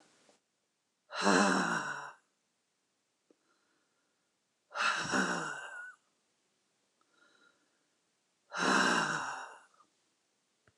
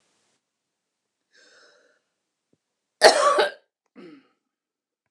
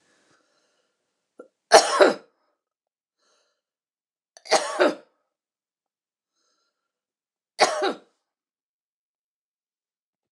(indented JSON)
{
  "exhalation_length": "10.8 s",
  "exhalation_amplitude": 7939,
  "exhalation_signal_mean_std_ratio": 0.39,
  "cough_length": "5.1 s",
  "cough_amplitude": 29204,
  "cough_signal_mean_std_ratio": 0.22,
  "three_cough_length": "10.3 s",
  "three_cough_amplitude": 29203,
  "three_cough_signal_mean_std_ratio": 0.22,
  "survey_phase": "beta (2021-08-13 to 2022-03-07)",
  "age": "45-64",
  "gender": "Female",
  "wearing_mask": "No",
  "symptom_none": true,
  "smoker_status": "Never smoked",
  "respiratory_condition_asthma": false,
  "respiratory_condition_other": false,
  "recruitment_source": "REACT",
  "submission_delay": "0 days",
  "covid_test_result": "Negative",
  "covid_test_method": "RT-qPCR",
  "influenza_a_test_result": "Negative",
  "influenza_b_test_result": "Negative"
}